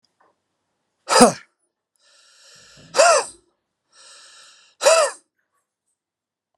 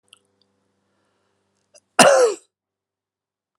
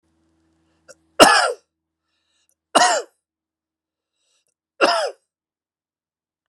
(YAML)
exhalation_length: 6.6 s
exhalation_amplitude: 32768
exhalation_signal_mean_std_ratio: 0.28
cough_length: 3.6 s
cough_amplitude: 32768
cough_signal_mean_std_ratio: 0.25
three_cough_length: 6.5 s
three_cough_amplitude: 32768
three_cough_signal_mean_std_ratio: 0.27
survey_phase: beta (2021-08-13 to 2022-03-07)
age: 45-64
gender: Male
wearing_mask: 'No'
symptom_none: true
smoker_status: Never smoked
respiratory_condition_asthma: false
respiratory_condition_other: false
recruitment_source: Test and Trace
submission_delay: 0 days
covid_test_result: Negative
covid_test_method: RT-qPCR